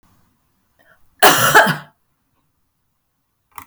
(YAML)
cough_length: 3.7 s
cough_amplitude: 32768
cough_signal_mean_std_ratio: 0.3
survey_phase: beta (2021-08-13 to 2022-03-07)
age: 65+
gender: Female
wearing_mask: 'No'
symptom_none: true
smoker_status: Ex-smoker
respiratory_condition_asthma: false
respiratory_condition_other: false
recruitment_source: REACT
submission_delay: 2 days
covid_test_result: Negative
covid_test_method: RT-qPCR
influenza_a_test_result: Negative
influenza_b_test_result: Negative